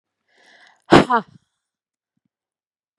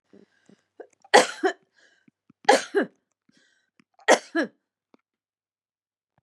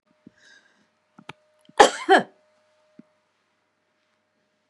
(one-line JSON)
{"exhalation_length": "3.0 s", "exhalation_amplitude": 32768, "exhalation_signal_mean_std_ratio": 0.21, "three_cough_length": "6.2 s", "three_cough_amplitude": 31219, "three_cough_signal_mean_std_ratio": 0.24, "cough_length": "4.7 s", "cough_amplitude": 32767, "cough_signal_mean_std_ratio": 0.18, "survey_phase": "beta (2021-08-13 to 2022-03-07)", "age": "65+", "gender": "Female", "wearing_mask": "No", "symptom_shortness_of_breath": true, "symptom_change_to_sense_of_smell_or_taste": true, "symptom_loss_of_taste": true, "symptom_onset": "3 days", "smoker_status": "Ex-smoker", "respiratory_condition_asthma": false, "respiratory_condition_other": false, "recruitment_source": "Test and Trace", "submission_delay": "2 days", "covid_test_result": "Positive", "covid_test_method": "RT-qPCR"}